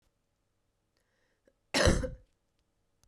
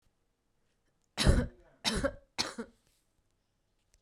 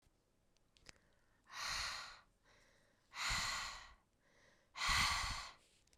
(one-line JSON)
{"cough_length": "3.1 s", "cough_amplitude": 10364, "cough_signal_mean_std_ratio": 0.26, "three_cough_length": "4.0 s", "three_cough_amplitude": 8590, "three_cough_signal_mean_std_ratio": 0.31, "exhalation_length": "6.0 s", "exhalation_amplitude": 2393, "exhalation_signal_mean_std_ratio": 0.47, "survey_phase": "beta (2021-08-13 to 2022-03-07)", "age": "18-44", "gender": "Female", "wearing_mask": "No", "symptom_cough_any": true, "symptom_runny_or_blocked_nose": true, "smoker_status": "Never smoked", "respiratory_condition_asthma": false, "respiratory_condition_other": false, "recruitment_source": "REACT", "submission_delay": "2 days", "covid_test_result": "Negative", "covid_test_method": "RT-qPCR", "influenza_a_test_result": "Unknown/Void", "influenza_b_test_result": "Unknown/Void"}